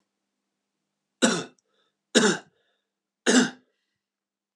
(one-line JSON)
{"three_cough_length": "4.6 s", "three_cough_amplitude": 22452, "three_cough_signal_mean_std_ratio": 0.29, "survey_phase": "alpha (2021-03-01 to 2021-08-12)", "age": "45-64", "gender": "Male", "wearing_mask": "No", "symptom_none": true, "smoker_status": "Current smoker (e-cigarettes or vapes only)", "respiratory_condition_asthma": false, "respiratory_condition_other": false, "recruitment_source": "REACT", "submission_delay": "2 days", "covid_test_result": "Negative", "covid_test_method": "RT-qPCR"}